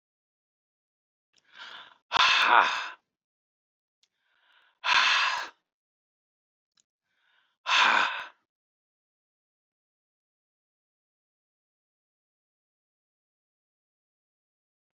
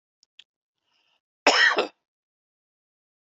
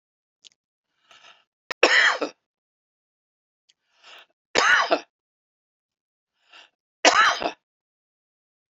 {"exhalation_length": "14.9 s", "exhalation_amplitude": 17411, "exhalation_signal_mean_std_ratio": 0.27, "cough_length": "3.3 s", "cough_amplitude": 23257, "cough_signal_mean_std_ratio": 0.26, "three_cough_length": "8.7 s", "three_cough_amplitude": 27053, "three_cough_signal_mean_std_ratio": 0.29, "survey_phase": "beta (2021-08-13 to 2022-03-07)", "age": "65+", "gender": "Male", "wearing_mask": "No", "symptom_none": true, "smoker_status": "Never smoked", "respiratory_condition_asthma": false, "respiratory_condition_other": false, "recruitment_source": "REACT", "submission_delay": "3 days", "covid_test_result": "Negative", "covid_test_method": "RT-qPCR", "influenza_a_test_result": "Negative", "influenza_b_test_result": "Negative"}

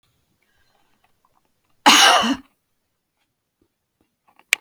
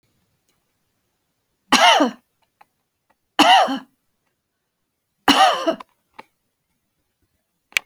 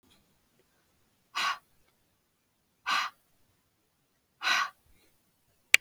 {"cough_length": "4.6 s", "cough_amplitude": 32768, "cough_signal_mean_std_ratio": 0.26, "three_cough_length": "7.9 s", "three_cough_amplitude": 32767, "three_cough_signal_mean_std_ratio": 0.3, "exhalation_length": "5.8 s", "exhalation_amplitude": 30483, "exhalation_signal_mean_std_ratio": 0.23, "survey_phase": "beta (2021-08-13 to 2022-03-07)", "age": "65+", "gender": "Female", "wearing_mask": "No", "symptom_none": true, "smoker_status": "Ex-smoker", "respiratory_condition_asthma": false, "respiratory_condition_other": false, "recruitment_source": "REACT", "submission_delay": "2 days", "covid_test_result": "Negative", "covid_test_method": "RT-qPCR"}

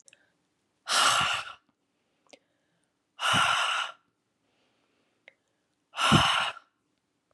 {"exhalation_length": "7.3 s", "exhalation_amplitude": 14420, "exhalation_signal_mean_std_ratio": 0.4, "survey_phase": "beta (2021-08-13 to 2022-03-07)", "age": "45-64", "gender": "Female", "wearing_mask": "No", "symptom_cough_any": true, "symptom_onset": "12 days", "smoker_status": "Current smoker (e-cigarettes or vapes only)", "respiratory_condition_asthma": true, "respiratory_condition_other": false, "recruitment_source": "REACT", "submission_delay": "7 days", "covid_test_result": "Negative", "covid_test_method": "RT-qPCR", "influenza_a_test_result": "Negative", "influenza_b_test_result": "Negative"}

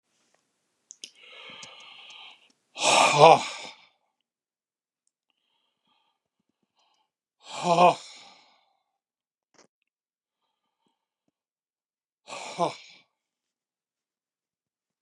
{"exhalation_length": "15.0 s", "exhalation_amplitude": 28940, "exhalation_signal_mean_std_ratio": 0.21, "survey_phase": "beta (2021-08-13 to 2022-03-07)", "age": "65+", "gender": "Male", "wearing_mask": "No", "symptom_none": true, "smoker_status": "Never smoked", "respiratory_condition_asthma": false, "respiratory_condition_other": false, "recruitment_source": "REACT", "submission_delay": "1 day", "covid_test_result": "Negative", "covid_test_method": "RT-qPCR", "influenza_a_test_result": "Negative", "influenza_b_test_result": "Negative"}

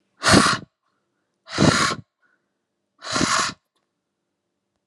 {"exhalation_length": "4.9 s", "exhalation_amplitude": 28413, "exhalation_signal_mean_std_ratio": 0.37, "survey_phase": "alpha (2021-03-01 to 2021-08-12)", "age": "18-44", "gender": "Female", "wearing_mask": "No", "symptom_none": true, "smoker_status": "Ex-smoker", "respiratory_condition_asthma": false, "respiratory_condition_other": false, "recruitment_source": "REACT", "submission_delay": "1 day", "covid_test_result": "Negative", "covid_test_method": "RT-qPCR"}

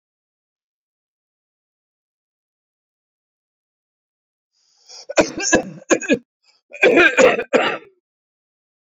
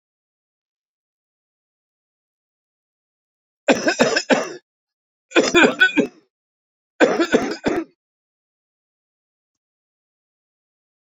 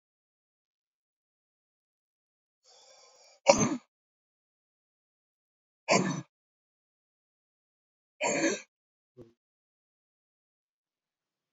{"cough_length": "8.9 s", "cough_amplitude": 32123, "cough_signal_mean_std_ratio": 0.3, "three_cough_length": "11.1 s", "three_cough_amplitude": 28050, "three_cough_signal_mean_std_ratio": 0.3, "exhalation_length": "11.5 s", "exhalation_amplitude": 22191, "exhalation_signal_mean_std_ratio": 0.2, "survey_phase": "beta (2021-08-13 to 2022-03-07)", "age": "65+", "gender": "Male", "wearing_mask": "No", "symptom_cough_any": true, "symptom_shortness_of_breath": true, "symptom_fatigue": true, "symptom_onset": "6 days", "smoker_status": "Ex-smoker", "respiratory_condition_asthma": false, "respiratory_condition_other": false, "recruitment_source": "Test and Trace", "submission_delay": "2 days", "covid_test_result": "Positive", "covid_test_method": "RT-qPCR", "covid_ct_value": 11.4, "covid_ct_gene": "ORF1ab gene", "covid_ct_mean": 11.9, "covid_viral_load": "130000000 copies/ml", "covid_viral_load_category": "High viral load (>1M copies/ml)"}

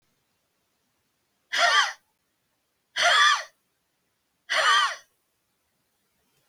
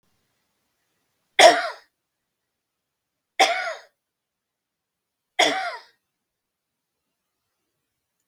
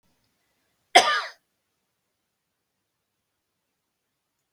{"exhalation_length": "6.5 s", "exhalation_amplitude": 14915, "exhalation_signal_mean_std_ratio": 0.36, "three_cough_length": "8.3 s", "three_cough_amplitude": 32768, "three_cough_signal_mean_std_ratio": 0.22, "cough_length": "4.5 s", "cough_amplitude": 32766, "cough_signal_mean_std_ratio": 0.16, "survey_phase": "beta (2021-08-13 to 2022-03-07)", "age": "65+", "gender": "Female", "wearing_mask": "No", "symptom_none": true, "smoker_status": "Ex-smoker", "respiratory_condition_asthma": false, "respiratory_condition_other": false, "recruitment_source": "REACT", "submission_delay": "2 days", "covid_test_result": "Negative", "covid_test_method": "RT-qPCR", "influenza_a_test_result": "Negative", "influenza_b_test_result": "Negative"}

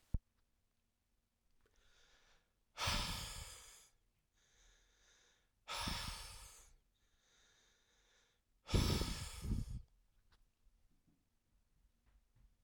{"exhalation_length": "12.6 s", "exhalation_amplitude": 2991, "exhalation_signal_mean_std_ratio": 0.34, "survey_phase": "alpha (2021-03-01 to 2021-08-12)", "age": "45-64", "gender": "Male", "wearing_mask": "No", "symptom_new_continuous_cough": true, "symptom_shortness_of_breath": true, "symptom_onset": "6 days", "smoker_status": "Current smoker (e-cigarettes or vapes only)", "respiratory_condition_asthma": false, "respiratory_condition_other": false, "recruitment_source": "Test and Trace", "submission_delay": "2 days", "covid_test_result": "Positive", "covid_test_method": "RT-qPCR", "covid_ct_value": 15.8, "covid_ct_gene": "ORF1ab gene", "covid_ct_mean": 16.1, "covid_viral_load": "5300000 copies/ml", "covid_viral_load_category": "High viral load (>1M copies/ml)"}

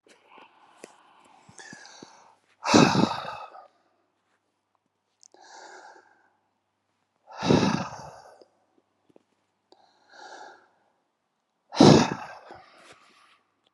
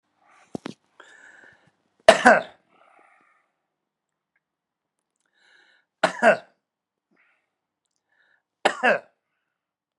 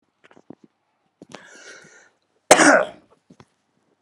{"exhalation_length": "13.7 s", "exhalation_amplitude": 25810, "exhalation_signal_mean_std_ratio": 0.24, "three_cough_length": "10.0 s", "three_cough_amplitude": 32768, "three_cough_signal_mean_std_ratio": 0.19, "cough_length": "4.0 s", "cough_amplitude": 32768, "cough_signal_mean_std_ratio": 0.23, "survey_phase": "beta (2021-08-13 to 2022-03-07)", "age": "45-64", "gender": "Male", "wearing_mask": "No", "symptom_none": true, "smoker_status": "Ex-smoker", "respiratory_condition_asthma": false, "respiratory_condition_other": false, "recruitment_source": "REACT", "submission_delay": "1 day", "covid_test_result": "Negative", "covid_test_method": "RT-qPCR", "influenza_a_test_result": "Negative", "influenza_b_test_result": "Negative"}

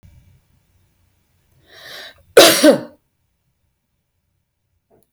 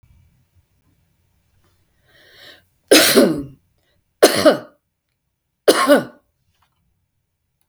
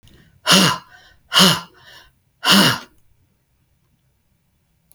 {"cough_length": "5.1 s", "cough_amplitude": 32768, "cough_signal_mean_std_ratio": 0.23, "three_cough_length": "7.7 s", "three_cough_amplitude": 32768, "three_cough_signal_mean_std_ratio": 0.3, "exhalation_length": "4.9 s", "exhalation_amplitude": 32768, "exhalation_signal_mean_std_ratio": 0.34, "survey_phase": "beta (2021-08-13 to 2022-03-07)", "age": "65+", "gender": "Female", "wearing_mask": "No", "symptom_none": true, "smoker_status": "Never smoked", "respiratory_condition_asthma": true, "respiratory_condition_other": false, "recruitment_source": "REACT", "submission_delay": "2 days", "covid_test_result": "Negative", "covid_test_method": "RT-qPCR", "influenza_a_test_result": "Negative", "influenza_b_test_result": "Negative"}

